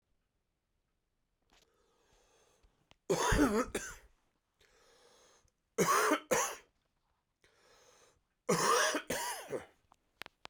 {"three_cough_length": "10.5 s", "three_cough_amplitude": 4535, "three_cough_signal_mean_std_ratio": 0.38, "survey_phase": "beta (2021-08-13 to 2022-03-07)", "age": "45-64", "gender": "Male", "wearing_mask": "No", "symptom_cough_any": true, "symptom_runny_or_blocked_nose": true, "symptom_shortness_of_breath": true, "symptom_sore_throat": true, "symptom_fatigue": true, "symptom_headache": true, "symptom_change_to_sense_of_smell_or_taste": true, "symptom_other": true, "symptom_onset": "4 days", "smoker_status": "Ex-smoker", "respiratory_condition_asthma": false, "respiratory_condition_other": false, "recruitment_source": "Test and Trace", "submission_delay": "2 days", "covid_test_result": "Positive", "covid_test_method": "RT-qPCR", "covid_ct_value": 17.0, "covid_ct_gene": "ORF1ab gene"}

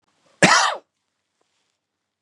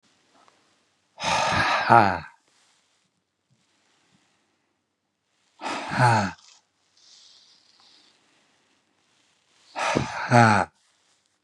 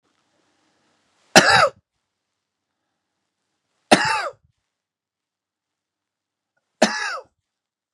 {"cough_length": "2.2 s", "cough_amplitude": 32101, "cough_signal_mean_std_ratio": 0.29, "exhalation_length": "11.4 s", "exhalation_amplitude": 31300, "exhalation_signal_mean_std_ratio": 0.32, "three_cough_length": "7.9 s", "three_cough_amplitude": 32768, "three_cough_signal_mean_std_ratio": 0.24, "survey_phase": "beta (2021-08-13 to 2022-03-07)", "age": "65+", "gender": "Male", "wearing_mask": "No", "symptom_cough_any": true, "smoker_status": "Ex-smoker", "respiratory_condition_asthma": false, "respiratory_condition_other": false, "recruitment_source": "REACT", "submission_delay": "1 day", "covid_test_result": "Negative", "covid_test_method": "RT-qPCR", "influenza_a_test_result": "Negative", "influenza_b_test_result": "Negative"}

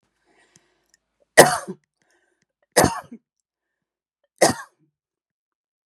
{"three_cough_length": "5.9 s", "three_cough_amplitude": 32768, "three_cough_signal_mean_std_ratio": 0.2, "survey_phase": "beta (2021-08-13 to 2022-03-07)", "age": "45-64", "gender": "Female", "wearing_mask": "No", "symptom_none": true, "smoker_status": "Ex-smoker", "respiratory_condition_asthma": false, "respiratory_condition_other": false, "recruitment_source": "REACT", "submission_delay": "6 days", "covid_test_result": "Negative", "covid_test_method": "RT-qPCR", "influenza_a_test_result": "Negative", "influenza_b_test_result": "Negative"}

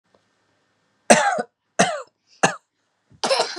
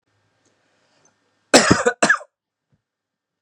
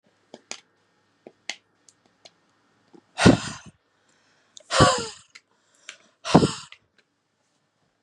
{"three_cough_length": "3.6 s", "three_cough_amplitude": 32768, "three_cough_signal_mean_std_ratio": 0.35, "cough_length": "3.4 s", "cough_amplitude": 32768, "cough_signal_mean_std_ratio": 0.27, "exhalation_length": "8.0 s", "exhalation_amplitude": 32708, "exhalation_signal_mean_std_ratio": 0.23, "survey_phase": "beta (2021-08-13 to 2022-03-07)", "age": "18-44", "gender": "Male", "wearing_mask": "No", "symptom_none": true, "smoker_status": "Never smoked", "respiratory_condition_asthma": false, "respiratory_condition_other": false, "recruitment_source": "REACT", "submission_delay": "3 days", "covid_test_result": "Negative", "covid_test_method": "RT-qPCR"}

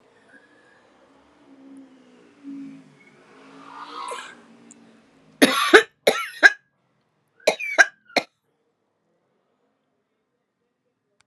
{"three_cough_length": "11.3 s", "three_cough_amplitude": 32768, "three_cough_signal_mean_std_ratio": 0.22, "survey_phase": "alpha (2021-03-01 to 2021-08-12)", "age": "65+", "gender": "Female", "wearing_mask": "No", "symptom_cough_any": true, "symptom_fatigue": true, "symptom_headache": true, "smoker_status": "Ex-smoker", "respiratory_condition_asthma": false, "respiratory_condition_other": false, "recruitment_source": "Test and Trace", "submission_delay": "2 days", "covid_test_result": "Positive", "covid_test_method": "RT-qPCR", "covid_ct_value": 33.9, "covid_ct_gene": "N gene"}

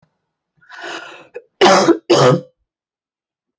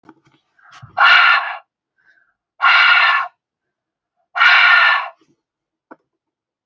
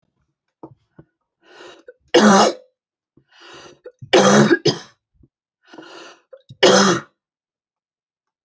{"cough_length": "3.6 s", "cough_amplitude": 30667, "cough_signal_mean_std_ratio": 0.38, "exhalation_length": "6.7 s", "exhalation_amplitude": 30214, "exhalation_signal_mean_std_ratio": 0.45, "three_cough_length": "8.4 s", "three_cough_amplitude": 29510, "three_cough_signal_mean_std_ratio": 0.33, "survey_phase": "beta (2021-08-13 to 2022-03-07)", "age": "45-64", "gender": "Female", "wearing_mask": "No", "symptom_none": true, "smoker_status": "Prefer not to say", "respiratory_condition_asthma": false, "respiratory_condition_other": false, "recruitment_source": "REACT", "submission_delay": "1 day", "covid_test_result": "Negative", "covid_test_method": "RT-qPCR"}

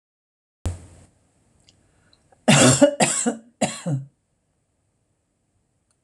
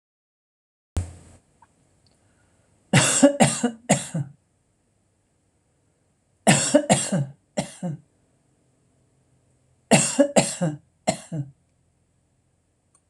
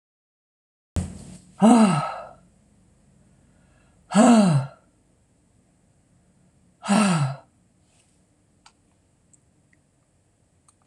{"cough_length": "6.0 s", "cough_amplitude": 25220, "cough_signal_mean_std_ratio": 0.32, "three_cough_length": "13.1 s", "three_cough_amplitude": 25916, "three_cough_signal_mean_std_ratio": 0.33, "exhalation_length": "10.9 s", "exhalation_amplitude": 25361, "exhalation_signal_mean_std_ratio": 0.32, "survey_phase": "alpha (2021-03-01 to 2021-08-12)", "age": "65+", "gender": "Female", "wearing_mask": "No", "symptom_none": true, "smoker_status": "Never smoked", "respiratory_condition_asthma": false, "respiratory_condition_other": false, "recruitment_source": "REACT", "submission_delay": "1 day", "covid_test_result": "Negative", "covid_test_method": "RT-qPCR"}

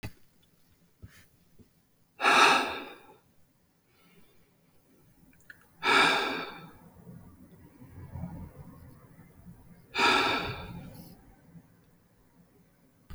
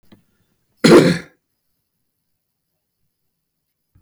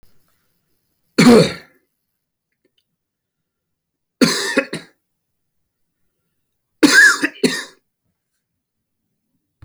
{"exhalation_length": "13.1 s", "exhalation_amplitude": 14283, "exhalation_signal_mean_std_ratio": 0.34, "cough_length": "4.0 s", "cough_amplitude": 32768, "cough_signal_mean_std_ratio": 0.23, "three_cough_length": "9.6 s", "three_cough_amplitude": 32357, "three_cough_signal_mean_std_ratio": 0.28, "survey_phase": "beta (2021-08-13 to 2022-03-07)", "age": "65+", "gender": "Male", "wearing_mask": "No", "symptom_none": true, "smoker_status": "Never smoked", "respiratory_condition_asthma": false, "respiratory_condition_other": false, "recruitment_source": "REACT", "submission_delay": "1 day", "covid_test_result": "Negative", "covid_test_method": "RT-qPCR"}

